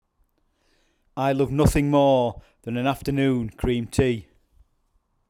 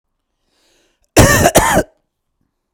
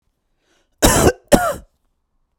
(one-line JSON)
{"exhalation_length": "5.3 s", "exhalation_amplitude": 20646, "exhalation_signal_mean_std_ratio": 0.58, "cough_length": "2.7 s", "cough_amplitude": 32768, "cough_signal_mean_std_ratio": 0.38, "three_cough_length": "2.4 s", "three_cough_amplitude": 32768, "three_cough_signal_mean_std_ratio": 0.35, "survey_phase": "beta (2021-08-13 to 2022-03-07)", "age": "45-64", "gender": "Male", "wearing_mask": "No", "symptom_none": true, "smoker_status": "Never smoked", "respiratory_condition_asthma": false, "respiratory_condition_other": false, "recruitment_source": "REACT", "submission_delay": "1 day", "covid_test_result": "Negative", "covid_test_method": "RT-qPCR"}